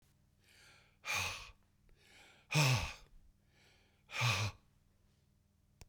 exhalation_length: 5.9 s
exhalation_amplitude: 3728
exhalation_signal_mean_std_ratio: 0.37
survey_phase: beta (2021-08-13 to 2022-03-07)
age: 65+
gender: Male
wearing_mask: 'No'
symptom_cough_any: true
symptom_sore_throat: true
symptom_fatigue: true
symptom_headache: true
smoker_status: Ex-smoker
respiratory_condition_asthma: false
respiratory_condition_other: false
recruitment_source: Test and Trace
submission_delay: 3 days
covid_test_result: Positive
covid_test_method: ePCR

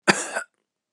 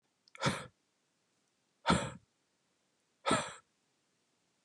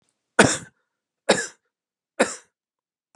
cough_length: 0.9 s
cough_amplitude: 28927
cough_signal_mean_std_ratio: 0.34
exhalation_length: 4.6 s
exhalation_amplitude: 6254
exhalation_signal_mean_std_ratio: 0.29
three_cough_length: 3.2 s
three_cough_amplitude: 32767
three_cough_signal_mean_std_ratio: 0.25
survey_phase: beta (2021-08-13 to 2022-03-07)
age: 45-64
gender: Male
wearing_mask: 'No'
symptom_runny_or_blocked_nose: true
symptom_onset: 12 days
smoker_status: Never smoked
respiratory_condition_asthma: false
respiratory_condition_other: false
recruitment_source: REACT
submission_delay: 1 day
covid_test_result: Negative
covid_test_method: RT-qPCR
influenza_a_test_result: Negative
influenza_b_test_result: Negative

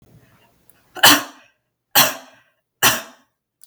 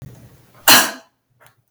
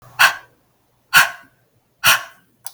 three_cough_length: 3.7 s
three_cough_amplitude: 32768
three_cough_signal_mean_std_ratio: 0.3
cough_length: 1.7 s
cough_amplitude: 32768
cough_signal_mean_std_ratio: 0.3
exhalation_length: 2.7 s
exhalation_amplitude: 32768
exhalation_signal_mean_std_ratio: 0.33
survey_phase: beta (2021-08-13 to 2022-03-07)
age: 45-64
gender: Female
wearing_mask: 'No'
symptom_none: true
smoker_status: Never smoked
respiratory_condition_asthma: false
respiratory_condition_other: false
recruitment_source: REACT
submission_delay: 2 days
covid_test_result: Negative
covid_test_method: RT-qPCR
influenza_a_test_result: Negative
influenza_b_test_result: Negative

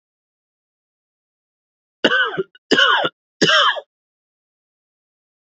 three_cough_length: 5.5 s
three_cough_amplitude: 30077
three_cough_signal_mean_std_ratio: 0.35
survey_phase: beta (2021-08-13 to 2022-03-07)
age: 18-44
gender: Male
wearing_mask: 'No'
symptom_cough_any: true
symptom_runny_or_blocked_nose: true
symptom_shortness_of_breath: true
symptom_sore_throat: true
symptom_fatigue: true
symptom_headache: true
symptom_other: true
symptom_onset: 4 days
smoker_status: Current smoker (e-cigarettes or vapes only)
respiratory_condition_asthma: false
respiratory_condition_other: false
recruitment_source: Test and Trace
submission_delay: 1 day
covid_test_result: Positive
covid_test_method: RT-qPCR
covid_ct_value: 20.2
covid_ct_gene: ORF1ab gene
covid_ct_mean: 20.3
covid_viral_load: 220000 copies/ml
covid_viral_load_category: Low viral load (10K-1M copies/ml)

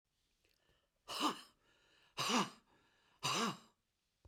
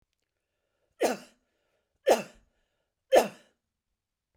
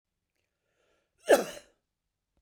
exhalation_length: 4.3 s
exhalation_amplitude: 2942
exhalation_signal_mean_std_ratio: 0.38
three_cough_length: 4.4 s
three_cough_amplitude: 13995
three_cough_signal_mean_std_ratio: 0.23
cough_length: 2.4 s
cough_amplitude: 12186
cough_signal_mean_std_ratio: 0.19
survey_phase: beta (2021-08-13 to 2022-03-07)
age: 65+
gender: Male
wearing_mask: 'No'
symptom_none: true
smoker_status: Never smoked
respiratory_condition_asthma: false
respiratory_condition_other: false
recruitment_source: REACT
submission_delay: 1 day
covid_test_result: Negative
covid_test_method: RT-qPCR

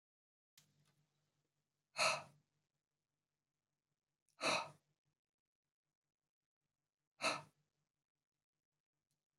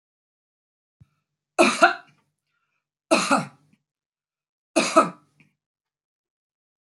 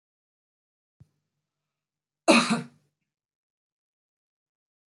exhalation_length: 9.4 s
exhalation_amplitude: 2482
exhalation_signal_mean_std_ratio: 0.21
three_cough_length: 6.8 s
three_cough_amplitude: 24767
three_cough_signal_mean_std_ratio: 0.26
cough_length: 4.9 s
cough_amplitude: 17446
cough_signal_mean_std_ratio: 0.18
survey_phase: beta (2021-08-13 to 2022-03-07)
age: 45-64
gender: Female
wearing_mask: 'No'
symptom_runny_or_blocked_nose: true
smoker_status: Ex-smoker
respiratory_condition_asthma: false
respiratory_condition_other: false
recruitment_source: REACT
submission_delay: 1 day
covid_test_result: Negative
covid_test_method: RT-qPCR
influenza_a_test_result: Unknown/Void
influenza_b_test_result: Unknown/Void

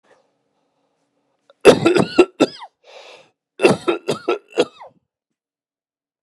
cough_length: 6.2 s
cough_amplitude: 32768
cough_signal_mean_std_ratio: 0.3
survey_phase: beta (2021-08-13 to 2022-03-07)
age: 65+
gender: Male
wearing_mask: 'No'
symptom_none: true
smoker_status: Ex-smoker
respiratory_condition_asthma: false
respiratory_condition_other: false
recruitment_source: REACT
submission_delay: 2 days
covid_test_result: Negative
covid_test_method: RT-qPCR
influenza_a_test_result: Negative
influenza_b_test_result: Negative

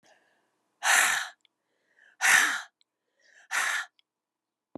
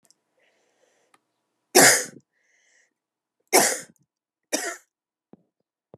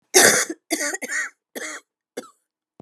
exhalation_length: 4.8 s
exhalation_amplitude: 13478
exhalation_signal_mean_std_ratio: 0.38
three_cough_length: 6.0 s
three_cough_amplitude: 28758
three_cough_signal_mean_std_ratio: 0.24
cough_length: 2.8 s
cough_amplitude: 32417
cough_signal_mean_std_ratio: 0.39
survey_phase: alpha (2021-03-01 to 2021-08-12)
age: 45-64
gender: Female
wearing_mask: 'No'
symptom_cough_any: true
symptom_fatigue: true
symptom_onset: 3 days
smoker_status: Never smoked
respiratory_condition_asthma: false
respiratory_condition_other: false
recruitment_source: Test and Trace
submission_delay: 2 days
covid_test_result: Positive
covid_test_method: RT-qPCR
covid_ct_value: 19.6
covid_ct_gene: ORF1ab gene
covid_ct_mean: 20.0
covid_viral_load: 270000 copies/ml
covid_viral_load_category: Low viral load (10K-1M copies/ml)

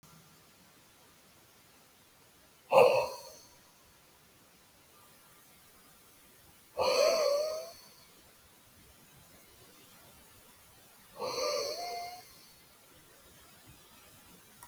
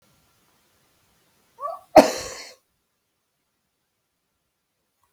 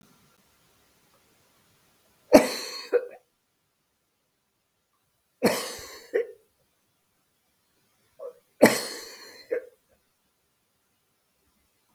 exhalation_length: 14.7 s
exhalation_amplitude: 11762
exhalation_signal_mean_std_ratio: 0.32
cough_length: 5.1 s
cough_amplitude: 32768
cough_signal_mean_std_ratio: 0.15
three_cough_length: 11.9 s
three_cough_amplitude: 32766
three_cough_signal_mean_std_ratio: 0.21
survey_phase: beta (2021-08-13 to 2022-03-07)
age: 65+
gender: Male
wearing_mask: 'No'
symptom_none: true
smoker_status: Never smoked
respiratory_condition_asthma: false
respiratory_condition_other: false
recruitment_source: REACT
submission_delay: 3 days
covid_test_result: Negative
covid_test_method: RT-qPCR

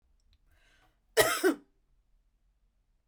cough_length: 3.1 s
cough_amplitude: 13275
cough_signal_mean_std_ratio: 0.26
survey_phase: beta (2021-08-13 to 2022-03-07)
age: 18-44
gender: Female
wearing_mask: 'No'
symptom_diarrhoea: true
symptom_fatigue: true
symptom_headache: true
symptom_change_to_sense_of_smell_or_taste: true
smoker_status: Ex-smoker
respiratory_condition_asthma: false
respiratory_condition_other: false
recruitment_source: REACT
submission_delay: 2 days
covid_test_result: Negative
covid_test_method: RT-qPCR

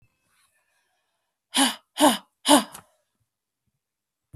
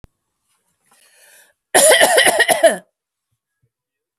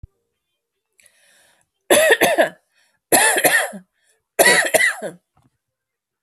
exhalation_length: 4.4 s
exhalation_amplitude: 22437
exhalation_signal_mean_std_ratio: 0.27
cough_length: 4.2 s
cough_amplitude: 32768
cough_signal_mean_std_ratio: 0.38
three_cough_length: 6.2 s
three_cough_amplitude: 32768
three_cough_signal_mean_std_ratio: 0.42
survey_phase: beta (2021-08-13 to 2022-03-07)
age: 18-44
gender: Female
wearing_mask: 'No'
symptom_other: true
smoker_status: Never smoked
respiratory_condition_asthma: true
respiratory_condition_other: false
recruitment_source: REACT
submission_delay: 0 days
covid_test_result: Negative
covid_test_method: RT-qPCR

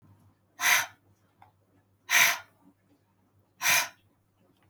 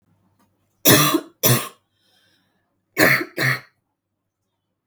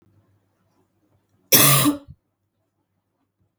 exhalation_length: 4.7 s
exhalation_amplitude: 13000
exhalation_signal_mean_std_ratio: 0.32
three_cough_length: 4.9 s
three_cough_amplitude: 32768
three_cough_signal_mean_std_ratio: 0.35
cough_length: 3.6 s
cough_amplitude: 32768
cough_signal_mean_std_ratio: 0.28
survey_phase: beta (2021-08-13 to 2022-03-07)
age: 18-44
gender: Female
wearing_mask: 'No'
symptom_cough_any: true
symptom_runny_or_blocked_nose: true
symptom_sore_throat: true
symptom_fatigue: true
symptom_headache: true
smoker_status: Never smoked
respiratory_condition_asthma: false
respiratory_condition_other: false
recruitment_source: Test and Trace
submission_delay: 2 days
covid_test_result: Positive
covid_test_method: LFT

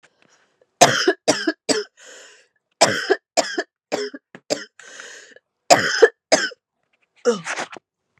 three_cough_length: 8.2 s
three_cough_amplitude: 32768
three_cough_signal_mean_std_ratio: 0.36
survey_phase: beta (2021-08-13 to 2022-03-07)
age: 18-44
gender: Female
wearing_mask: 'No'
symptom_cough_any: true
symptom_new_continuous_cough: true
symptom_runny_or_blocked_nose: true
symptom_shortness_of_breath: true
symptom_sore_throat: true
symptom_fatigue: true
symptom_headache: true
symptom_change_to_sense_of_smell_or_taste: true
symptom_other: true
symptom_onset: 3 days
smoker_status: Never smoked
respiratory_condition_asthma: false
respiratory_condition_other: false
recruitment_source: Test and Trace
submission_delay: 1 day
covid_test_result: Positive
covid_test_method: ePCR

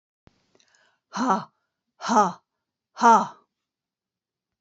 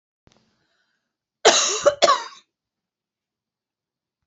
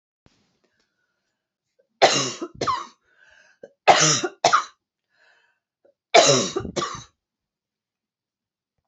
exhalation_length: 4.6 s
exhalation_amplitude: 21865
exhalation_signal_mean_std_ratio: 0.3
cough_length: 4.3 s
cough_amplitude: 29741
cough_signal_mean_std_ratio: 0.28
three_cough_length: 8.9 s
three_cough_amplitude: 32622
three_cough_signal_mean_std_ratio: 0.31
survey_phase: beta (2021-08-13 to 2022-03-07)
age: 65+
gender: Female
wearing_mask: 'No'
symptom_none: true
smoker_status: Never smoked
respiratory_condition_asthma: false
respiratory_condition_other: false
recruitment_source: REACT
submission_delay: 2 days
covid_test_result: Negative
covid_test_method: RT-qPCR
influenza_a_test_result: Negative
influenza_b_test_result: Negative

